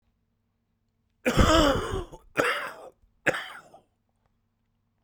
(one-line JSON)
{"cough_length": "5.0 s", "cough_amplitude": 16298, "cough_signal_mean_std_ratio": 0.37, "survey_phase": "beta (2021-08-13 to 2022-03-07)", "age": "18-44", "gender": "Male", "wearing_mask": "No", "symptom_cough_any": true, "symptom_new_continuous_cough": true, "symptom_runny_or_blocked_nose": true, "symptom_shortness_of_breath": true, "symptom_sore_throat": true, "symptom_abdominal_pain": true, "symptom_diarrhoea": true, "symptom_fatigue": true, "symptom_fever_high_temperature": true, "symptom_headache": true, "symptom_change_to_sense_of_smell_or_taste": true, "symptom_loss_of_taste": true, "symptom_onset": "2 days", "smoker_status": "Current smoker (1 to 10 cigarettes per day)", "respiratory_condition_asthma": false, "respiratory_condition_other": false, "recruitment_source": "Test and Trace", "submission_delay": "1 day", "covid_test_result": "Positive", "covid_test_method": "RT-qPCR", "covid_ct_value": 14.9, "covid_ct_gene": "ORF1ab gene", "covid_ct_mean": 15.2, "covid_viral_load": "10000000 copies/ml", "covid_viral_load_category": "High viral load (>1M copies/ml)"}